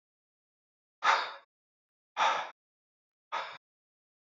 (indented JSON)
{
  "exhalation_length": "4.4 s",
  "exhalation_amplitude": 9047,
  "exhalation_signal_mean_std_ratio": 0.3,
  "survey_phase": "beta (2021-08-13 to 2022-03-07)",
  "age": "18-44",
  "gender": "Male",
  "wearing_mask": "No",
  "symptom_cough_any": true,
  "symptom_new_continuous_cough": true,
  "symptom_runny_or_blocked_nose": true,
  "symptom_sore_throat": true,
  "symptom_diarrhoea": true,
  "symptom_fatigue": true,
  "symptom_headache": true,
  "symptom_change_to_sense_of_smell_or_taste": true,
  "symptom_loss_of_taste": true,
  "symptom_onset": "2 days",
  "smoker_status": "Never smoked",
  "respiratory_condition_asthma": false,
  "respiratory_condition_other": false,
  "recruitment_source": "Test and Trace",
  "submission_delay": "1 day",
  "covid_test_result": "Positive",
  "covid_test_method": "RT-qPCR",
  "covid_ct_value": 20.8,
  "covid_ct_gene": "ORF1ab gene",
  "covid_ct_mean": 21.3,
  "covid_viral_load": "100000 copies/ml",
  "covid_viral_load_category": "Low viral load (10K-1M copies/ml)"
}